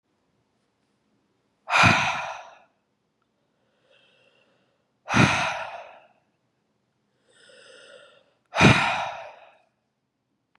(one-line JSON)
{"exhalation_length": "10.6 s", "exhalation_amplitude": 25072, "exhalation_signal_mean_std_ratio": 0.3, "survey_phase": "beta (2021-08-13 to 2022-03-07)", "age": "45-64", "gender": "Female", "wearing_mask": "No", "symptom_runny_or_blocked_nose": true, "symptom_sore_throat": true, "symptom_headache": true, "symptom_onset": "4 days", "smoker_status": "Never smoked", "respiratory_condition_asthma": false, "respiratory_condition_other": false, "recruitment_source": "Test and Trace", "submission_delay": "2 days", "covid_test_result": "Positive", "covid_test_method": "RT-qPCR", "covid_ct_value": 16.8, "covid_ct_gene": "N gene", "covid_ct_mean": 16.8, "covid_viral_load": "3000000 copies/ml", "covid_viral_load_category": "High viral load (>1M copies/ml)"}